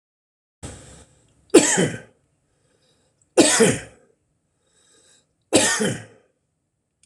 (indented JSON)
{
  "three_cough_length": "7.1 s",
  "three_cough_amplitude": 26028,
  "three_cough_signal_mean_std_ratio": 0.32,
  "survey_phase": "beta (2021-08-13 to 2022-03-07)",
  "age": "65+",
  "gender": "Male",
  "wearing_mask": "No",
  "symptom_none": true,
  "smoker_status": "Never smoked",
  "respiratory_condition_asthma": false,
  "respiratory_condition_other": false,
  "recruitment_source": "REACT",
  "submission_delay": "1 day",
  "covid_test_result": "Negative",
  "covid_test_method": "RT-qPCR"
}